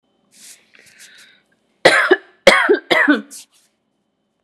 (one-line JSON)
{"three_cough_length": "4.4 s", "three_cough_amplitude": 32768, "three_cough_signal_mean_std_ratio": 0.36, "survey_phase": "beta (2021-08-13 to 2022-03-07)", "age": "18-44", "gender": "Female", "wearing_mask": "No", "symptom_none": true, "smoker_status": "Never smoked", "respiratory_condition_asthma": false, "respiratory_condition_other": false, "recruitment_source": "REACT", "submission_delay": "5 days", "covid_test_result": "Negative", "covid_test_method": "RT-qPCR"}